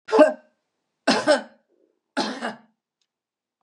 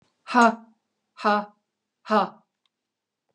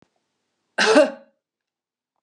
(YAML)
three_cough_length: 3.6 s
three_cough_amplitude: 27283
three_cough_signal_mean_std_ratio: 0.33
exhalation_length: 3.3 s
exhalation_amplitude: 23139
exhalation_signal_mean_std_ratio: 0.31
cough_length: 2.2 s
cough_amplitude: 26935
cough_signal_mean_std_ratio: 0.3
survey_phase: beta (2021-08-13 to 2022-03-07)
age: 65+
gender: Female
wearing_mask: 'No'
symptom_none: true
smoker_status: Never smoked
respiratory_condition_asthma: false
respiratory_condition_other: false
recruitment_source: REACT
submission_delay: 8 days
covid_test_result: Negative
covid_test_method: RT-qPCR
influenza_a_test_result: Negative
influenza_b_test_result: Negative